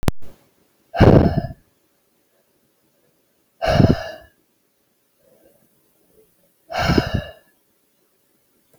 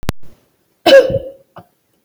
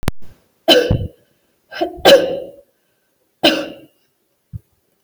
{"exhalation_length": "8.8 s", "exhalation_amplitude": 32768, "exhalation_signal_mean_std_ratio": 0.31, "cough_length": "2.0 s", "cough_amplitude": 32768, "cough_signal_mean_std_ratio": 0.38, "three_cough_length": "5.0 s", "three_cough_amplitude": 32768, "three_cough_signal_mean_std_ratio": 0.38, "survey_phase": "beta (2021-08-13 to 2022-03-07)", "age": "18-44", "gender": "Female", "wearing_mask": "No", "symptom_none": true, "smoker_status": "Never smoked", "respiratory_condition_asthma": false, "respiratory_condition_other": false, "recruitment_source": "Test and Trace", "submission_delay": "3 days", "covid_test_result": "Negative", "covid_test_method": "RT-qPCR"}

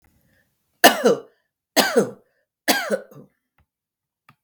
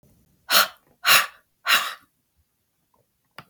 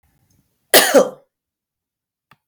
{"three_cough_length": "4.4 s", "three_cough_amplitude": 32768, "three_cough_signal_mean_std_ratio": 0.31, "exhalation_length": "3.5 s", "exhalation_amplitude": 32172, "exhalation_signal_mean_std_ratio": 0.32, "cough_length": "2.5 s", "cough_amplitude": 32768, "cough_signal_mean_std_ratio": 0.28, "survey_phase": "beta (2021-08-13 to 2022-03-07)", "age": "65+", "gender": "Female", "wearing_mask": "No", "symptom_cough_any": true, "smoker_status": "Ex-smoker", "respiratory_condition_asthma": false, "respiratory_condition_other": false, "recruitment_source": "REACT", "submission_delay": "3 days", "covid_test_result": "Negative", "covid_test_method": "RT-qPCR", "influenza_a_test_result": "Negative", "influenza_b_test_result": "Negative"}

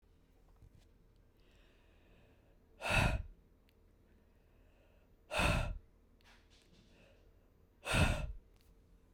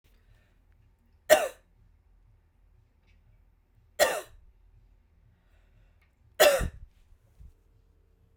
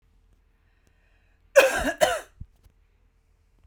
{"exhalation_length": "9.1 s", "exhalation_amplitude": 3807, "exhalation_signal_mean_std_ratio": 0.34, "three_cough_length": "8.4 s", "three_cough_amplitude": 25569, "three_cough_signal_mean_std_ratio": 0.22, "cough_length": "3.7 s", "cough_amplitude": 28932, "cough_signal_mean_std_ratio": 0.27, "survey_phase": "beta (2021-08-13 to 2022-03-07)", "age": "18-44", "gender": "Female", "wearing_mask": "No", "symptom_headache": true, "symptom_onset": "13 days", "smoker_status": "Ex-smoker", "respiratory_condition_asthma": false, "respiratory_condition_other": false, "recruitment_source": "REACT", "submission_delay": "1 day", "covid_test_result": "Negative", "covid_test_method": "RT-qPCR"}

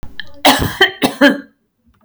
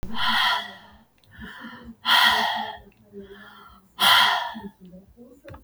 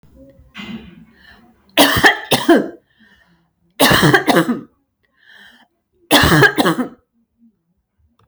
{"cough_length": "2.0 s", "cough_amplitude": 32768, "cough_signal_mean_std_ratio": 0.49, "exhalation_length": "5.6 s", "exhalation_amplitude": 21595, "exhalation_signal_mean_std_ratio": 0.5, "three_cough_length": "8.3 s", "three_cough_amplitude": 32768, "three_cough_signal_mean_std_ratio": 0.41, "survey_phase": "beta (2021-08-13 to 2022-03-07)", "age": "45-64", "gender": "Female", "wearing_mask": "No", "symptom_none": true, "smoker_status": "Never smoked", "respiratory_condition_asthma": false, "respiratory_condition_other": false, "recruitment_source": "REACT", "submission_delay": "2 days", "covid_test_result": "Negative", "covid_test_method": "RT-qPCR", "influenza_a_test_result": "Negative", "influenza_b_test_result": "Negative"}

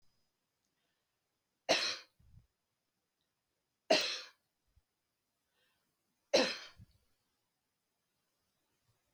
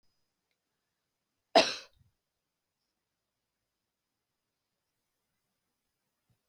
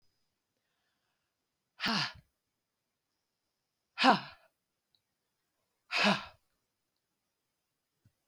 {"three_cough_length": "9.1 s", "three_cough_amplitude": 5170, "three_cough_signal_mean_std_ratio": 0.22, "cough_length": "6.5 s", "cough_amplitude": 15334, "cough_signal_mean_std_ratio": 0.11, "exhalation_length": "8.3 s", "exhalation_amplitude": 10733, "exhalation_signal_mean_std_ratio": 0.22, "survey_phase": "beta (2021-08-13 to 2022-03-07)", "age": "65+", "gender": "Female", "wearing_mask": "No", "symptom_none": true, "smoker_status": "Never smoked", "respiratory_condition_asthma": false, "respiratory_condition_other": false, "recruitment_source": "REACT", "submission_delay": "2 days", "covid_test_result": "Negative", "covid_test_method": "RT-qPCR"}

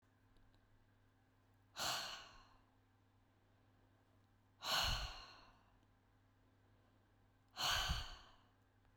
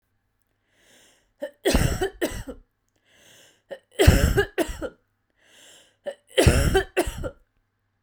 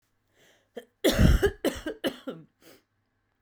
{"exhalation_length": "9.0 s", "exhalation_amplitude": 1758, "exhalation_signal_mean_std_ratio": 0.37, "three_cough_length": "8.0 s", "three_cough_amplitude": 30437, "three_cough_signal_mean_std_ratio": 0.38, "cough_length": "3.4 s", "cough_amplitude": 18896, "cough_signal_mean_std_ratio": 0.36, "survey_phase": "beta (2021-08-13 to 2022-03-07)", "age": "18-44", "gender": "Female", "wearing_mask": "No", "symptom_cough_any": true, "symptom_runny_or_blocked_nose": true, "symptom_onset": "5 days", "smoker_status": "Current smoker (11 or more cigarettes per day)", "respiratory_condition_asthma": false, "respiratory_condition_other": false, "recruitment_source": "REACT", "submission_delay": "1 day", "covid_test_result": "Negative", "covid_test_method": "RT-qPCR"}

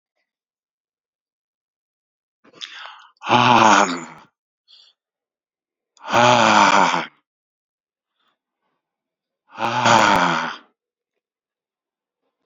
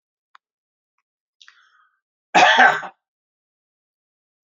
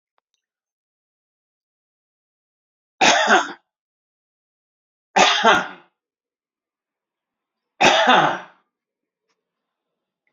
{"exhalation_length": "12.5 s", "exhalation_amplitude": 30794, "exhalation_signal_mean_std_ratio": 0.35, "cough_length": "4.5 s", "cough_amplitude": 32767, "cough_signal_mean_std_ratio": 0.25, "three_cough_length": "10.3 s", "three_cough_amplitude": 28904, "three_cough_signal_mean_std_ratio": 0.3, "survey_phase": "alpha (2021-03-01 to 2021-08-12)", "age": "45-64", "gender": "Male", "wearing_mask": "No", "symptom_none": true, "smoker_status": "Never smoked", "respiratory_condition_asthma": false, "respiratory_condition_other": false, "recruitment_source": "REACT", "submission_delay": "2 days", "covid_test_result": "Negative", "covid_test_method": "RT-qPCR"}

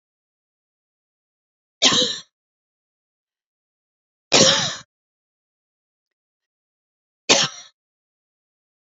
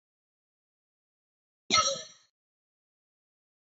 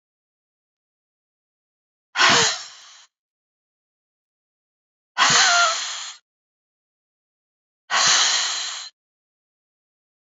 {"three_cough_length": "8.9 s", "three_cough_amplitude": 32528, "three_cough_signal_mean_std_ratio": 0.24, "cough_length": "3.8 s", "cough_amplitude": 11095, "cough_signal_mean_std_ratio": 0.21, "exhalation_length": "10.2 s", "exhalation_amplitude": 22562, "exhalation_signal_mean_std_ratio": 0.36, "survey_phase": "beta (2021-08-13 to 2022-03-07)", "age": "45-64", "gender": "Female", "wearing_mask": "No", "symptom_cough_any": true, "symptom_runny_or_blocked_nose": true, "symptom_fatigue": true, "symptom_change_to_sense_of_smell_or_taste": true, "symptom_onset": "1 day", "smoker_status": "Current smoker (e-cigarettes or vapes only)", "respiratory_condition_asthma": false, "respiratory_condition_other": false, "recruitment_source": "Test and Trace", "submission_delay": "1 day", "covid_test_result": "Positive", "covid_test_method": "RT-qPCR", "covid_ct_value": 18.0, "covid_ct_gene": "ORF1ab gene", "covid_ct_mean": 18.7, "covid_viral_load": "720000 copies/ml", "covid_viral_load_category": "Low viral load (10K-1M copies/ml)"}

